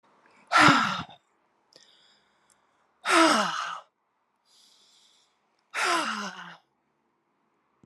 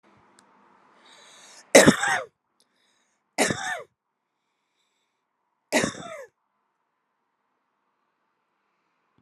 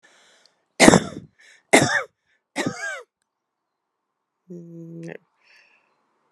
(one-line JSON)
{"exhalation_length": "7.9 s", "exhalation_amplitude": 20876, "exhalation_signal_mean_std_ratio": 0.34, "cough_length": "9.2 s", "cough_amplitude": 31485, "cough_signal_mean_std_ratio": 0.21, "three_cough_length": "6.3 s", "three_cough_amplitude": 32768, "three_cough_signal_mean_std_ratio": 0.25, "survey_phase": "alpha (2021-03-01 to 2021-08-12)", "age": "45-64", "gender": "Female", "wearing_mask": "No", "symptom_none": true, "smoker_status": "Never smoked", "respiratory_condition_asthma": false, "respiratory_condition_other": false, "recruitment_source": "REACT", "submission_delay": "2 days", "covid_test_result": "Negative", "covid_test_method": "RT-qPCR"}